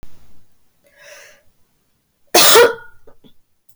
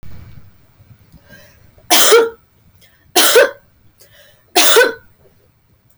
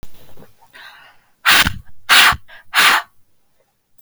{
  "cough_length": "3.8 s",
  "cough_amplitude": 32768,
  "cough_signal_mean_std_ratio": 0.32,
  "three_cough_length": "6.0 s",
  "three_cough_amplitude": 32768,
  "three_cough_signal_mean_std_ratio": 0.4,
  "exhalation_length": "4.0 s",
  "exhalation_amplitude": 32768,
  "exhalation_signal_mean_std_ratio": 0.44,
  "survey_phase": "beta (2021-08-13 to 2022-03-07)",
  "age": "18-44",
  "gender": "Female",
  "wearing_mask": "No",
  "symptom_none": true,
  "smoker_status": "Never smoked",
  "respiratory_condition_asthma": false,
  "respiratory_condition_other": false,
  "recruitment_source": "REACT",
  "submission_delay": "3 days",
  "covid_test_result": "Negative",
  "covid_test_method": "RT-qPCR"
}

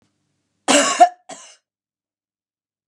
{
  "cough_length": "2.9 s",
  "cough_amplitude": 32767,
  "cough_signal_mean_std_ratio": 0.27,
  "survey_phase": "beta (2021-08-13 to 2022-03-07)",
  "age": "45-64",
  "gender": "Female",
  "wearing_mask": "No",
  "symptom_none": true,
  "symptom_onset": "12 days",
  "smoker_status": "Never smoked",
  "respiratory_condition_asthma": false,
  "respiratory_condition_other": false,
  "recruitment_source": "REACT",
  "submission_delay": "1 day",
  "covid_test_result": "Negative",
  "covid_test_method": "RT-qPCR",
  "influenza_a_test_result": "Negative",
  "influenza_b_test_result": "Negative"
}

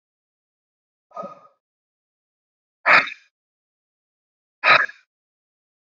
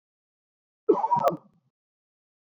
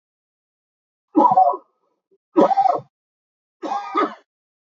{
  "exhalation_length": "6.0 s",
  "exhalation_amplitude": 32767,
  "exhalation_signal_mean_std_ratio": 0.21,
  "cough_length": "2.5 s",
  "cough_amplitude": 13059,
  "cough_signal_mean_std_ratio": 0.32,
  "three_cough_length": "4.8 s",
  "three_cough_amplitude": 25086,
  "three_cough_signal_mean_std_ratio": 0.38,
  "survey_phase": "beta (2021-08-13 to 2022-03-07)",
  "age": "45-64",
  "gender": "Male",
  "wearing_mask": "No",
  "symptom_cough_any": true,
  "symptom_fatigue": true,
  "symptom_headache": true,
  "smoker_status": "Current smoker (1 to 10 cigarettes per day)",
  "respiratory_condition_asthma": false,
  "respiratory_condition_other": false,
  "recruitment_source": "Test and Trace",
  "submission_delay": "1 day",
  "covid_test_result": "Positive",
  "covid_test_method": "ePCR"
}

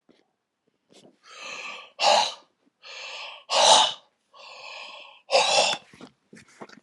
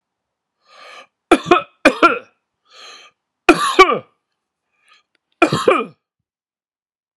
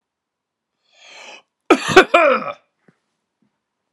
{
  "exhalation_length": "6.8 s",
  "exhalation_amplitude": 23577,
  "exhalation_signal_mean_std_ratio": 0.38,
  "three_cough_length": "7.2 s",
  "three_cough_amplitude": 32768,
  "three_cough_signal_mean_std_ratio": 0.3,
  "cough_length": "3.9 s",
  "cough_amplitude": 32768,
  "cough_signal_mean_std_ratio": 0.29,
  "survey_phase": "beta (2021-08-13 to 2022-03-07)",
  "age": "45-64",
  "gender": "Male",
  "wearing_mask": "No",
  "symptom_cough_any": true,
  "symptom_runny_or_blocked_nose": true,
  "symptom_shortness_of_breath": true,
  "symptom_fatigue": true,
  "symptom_headache": true,
  "symptom_change_to_sense_of_smell_or_taste": true,
  "symptom_loss_of_taste": true,
  "symptom_onset": "3 days",
  "smoker_status": "Never smoked",
  "respiratory_condition_asthma": false,
  "respiratory_condition_other": false,
  "recruitment_source": "Test and Trace",
  "submission_delay": "2 days",
  "covid_test_result": "Positive",
  "covid_test_method": "RT-qPCR"
}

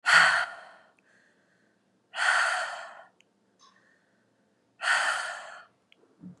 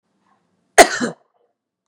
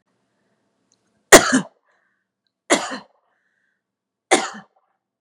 {
  "exhalation_length": "6.4 s",
  "exhalation_amplitude": 15939,
  "exhalation_signal_mean_std_ratio": 0.39,
  "cough_length": "1.9 s",
  "cough_amplitude": 32768,
  "cough_signal_mean_std_ratio": 0.22,
  "three_cough_length": "5.2 s",
  "three_cough_amplitude": 32768,
  "three_cough_signal_mean_std_ratio": 0.21,
  "survey_phase": "beta (2021-08-13 to 2022-03-07)",
  "age": "45-64",
  "gender": "Female",
  "wearing_mask": "No",
  "symptom_none": true,
  "smoker_status": "Never smoked",
  "respiratory_condition_asthma": false,
  "respiratory_condition_other": false,
  "recruitment_source": "REACT",
  "submission_delay": "1 day",
  "covid_test_result": "Negative",
  "covid_test_method": "RT-qPCR",
  "influenza_a_test_result": "Negative",
  "influenza_b_test_result": "Negative"
}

